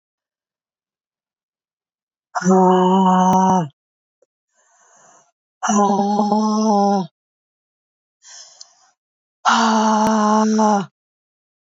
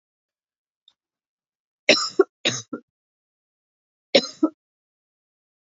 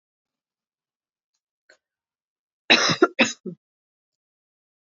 exhalation_length: 11.7 s
exhalation_amplitude: 27291
exhalation_signal_mean_std_ratio: 0.54
three_cough_length: 5.7 s
three_cough_amplitude: 26385
three_cough_signal_mean_std_ratio: 0.21
cough_length: 4.9 s
cough_amplitude: 30264
cough_signal_mean_std_ratio: 0.22
survey_phase: beta (2021-08-13 to 2022-03-07)
age: 18-44
gender: Female
wearing_mask: 'No'
symptom_cough_any: true
symptom_runny_or_blocked_nose: true
symptom_sore_throat: true
symptom_fatigue: true
symptom_other: true
symptom_onset: 2 days
smoker_status: Ex-smoker
respiratory_condition_asthma: false
respiratory_condition_other: false
recruitment_source: Test and Trace
submission_delay: 2 days
covid_test_result: Positive
covid_test_method: RT-qPCR
covid_ct_value: 27.1
covid_ct_gene: ORF1ab gene
covid_ct_mean: 27.9
covid_viral_load: 720 copies/ml
covid_viral_load_category: Minimal viral load (< 10K copies/ml)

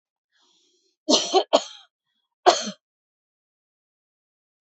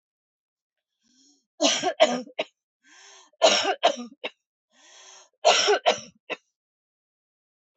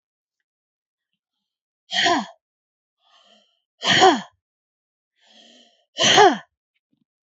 cough_length: 4.6 s
cough_amplitude: 27894
cough_signal_mean_std_ratio: 0.25
three_cough_length: 7.8 s
three_cough_amplitude: 18441
three_cough_signal_mean_std_ratio: 0.34
exhalation_length: 7.3 s
exhalation_amplitude: 29558
exhalation_signal_mean_std_ratio: 0.29
survey_phase: beta (2021-08-13 to 2022-03-07)
age: 45-64
gender: Female
wearing_mask: 'No'
symptom_none: true
symptom_onset: 3 days
smoker_status: Never smoked
respiratory_condition_asthma: false
respiratory_condition_other: false
recruitment_source: REACT
submission_delay: 7 days
covid_test_result: Negative
covid_test_method: RT-qPCR
influenza_a_test_result: Negative
influenza_b_test_result: Negative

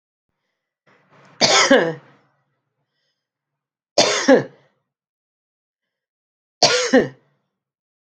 three_cough_length: 8.0 s
three_cough_amplitude: 32527
three_cough_signal_mean_std_ratio: 0.31
survey_phase: beta (2021-08-13 to 2022-03-07)
age: 65+
gender: Female
wearing_mask: 'No'
symptom_runny_or_blocked_nose: true
smoker_status: Ex-smoker
respiratory_condition_asthma: false
respiratory_condition_other: false
recruitment_source: REACT
submission_delay: 5 days
covid_test_result: Negative
covid_test_method: RT-qPCR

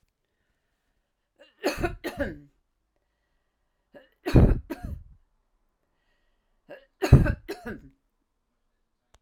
three_cough_length: 9.2 s
three_cough_amplitude: 27682
three_cough_signal_mean_std_ratio: 0.24
survey_phase: alpha (2021-03-01 to 2021-08-12)
age: 65+
gender: Female
wearing_mask: 'No'
symptom_none: true
smoker_status: Ex-smoker
respiratory_condition_asthma: false
respiratory_condition_other: false
recruitment_source: REACT
submission_delay: 2 days
covid_test_result: Negative
covid_test_method: RT-qPCR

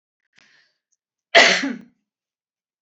cough_length: 2.8 s
cough_amplitude: 29772
cough_signal_mean_std_ratio: 0.26
survey_phase: beta (2021-08-13 to 2022-03-07)
age: 45-64
gender: Female
wearing_mask: 'No'
symptom_none: true
smoker_status: Ex-smoker
respiratory_condition_asthma: false
respiratory_condition_other: false
recruitment_source: REACT
submission_delay: 3 days
covid_test_result: Negative
covid_test_method: RT-qPCR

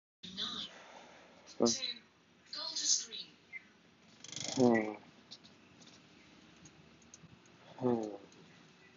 exhalation_length: 9.0 s
exhalation_amplitude: 5357
exhalation_signal_mean_std_ratio: 0.38
survey_phase: beta (2021-08-13 to 2022-03-07)
age: 18-44
gender: Male
wearing_mask: 'Yes'
symptom_none: true
smoker_status: Never smoked
respiratory_condition_asthma: false
respiratory_condition_other: false
recruitment_source: REACT
submission_delay: 2 days
covid_test_result: Negative
covid_test_method: RT-qPCR
influenza_a_test_result: Negative
influenza_b_test_result: Negative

